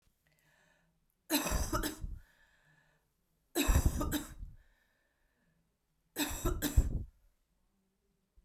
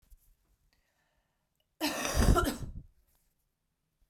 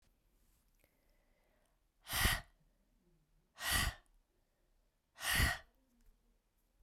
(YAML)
three_cough_length: 8.4 s
three_cough_amplitude: 6623
three_cough_signal_mean_std_ratio: 0.39
cough_length: 4.1 s
cough_amplitude: 9684
cough_signal_mean_std_ratio: 0.33
exhalation_length: 6.8 s
exhalation_amplitude: 3673
exhalation_signal_mean_std_ratio: 0.31
survey_phase: beta (2021-08-13 to 2022-03-07)
age: 18-44
gender: Female
wearing_mask: 'No'
symptom_cough_any: true
symptom_runny_or_blocked_nose: true
symptom_sore_throat: true
symptom_fatigue: true
symptom_fever_high_temperature: true
symptom_headache: true
symptom_change_to_sense_of_smell_or_taste: true
symptom_onset: 3 days
smoker_status: Never smoked
respiratory_condition_asthma: false
respiratory_condition_other: false
recruitment_source: Test and Trace
submission_delay: 2 days
covid_test_result: Positive
covid_test_method: RT-qPCR
covid_ct_value: 17.5
covid_ct_gene: ORF1ab gene